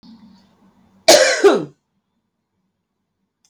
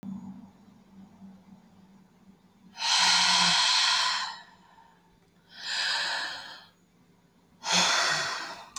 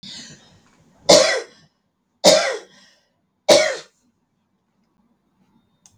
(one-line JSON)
{"cough_length": "3.5 s", "cough_amplitude": 32768, "cough_signal_mean_std_ratio": 0.3, "exhalation_length": "8.8 s", "exhalation_amplitude": 9906, "exhalation_signal_mean_std_ratio": 0.54, "three_cough_length": "6.0 s", "three_cough_amplitude": 32768, "three_cough_signal_mean_std_ratio": 0.3, "survey_phase": "beta (2021-08-13 to 2022-03-07)", "age": "45-64", "gender": "Female", "wearing_mask": "No", "symptom_none": true, "smoker_status": "Never smoked", "respiratory_condition_asthma": false, "respiratory_condition_other": false, "recruitment_source": "REACT", "submission_delay": "0 days", "covid_test_result": "Negative", "covid_test_method": "RT-qPCR"}